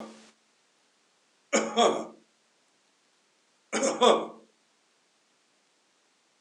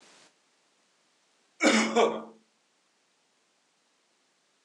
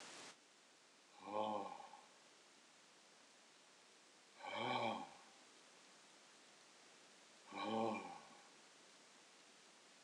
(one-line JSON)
{"three_cough_length": "6.4 s", "three_cough_amplitude": 16706, "three_cough_signal_mean_std_ratio": 0.29, "cough_length": "4.6 s", "cough_amplitude": 11405, "cough_signal_mean_std_ratio": 0.28, "exhalation_length": "10.0 s", "exhalation_amplitude": 1190, "exhalation_signal_mean_std_ratio": 0.47, "survey_phase": "beta (2021-08-13 to 2022-03-07)", "age": "65+", "gender": "Male", "wearing_mask": "No", "symptom_runny_or_blocked_nose": true, "smoker_status": "Ex-smoker", "respiratory_condition_asthma": false, "respiratory_condition_other": false, "recruitment_source": "REACT", "submission_delay": "4 days", "covid_test_result": "Negative", "covid_test_method": "RT-qPCR", "influenza_a_test_result": "Unknown/Void", "influenza_b_test_result": "Unknown/Void"}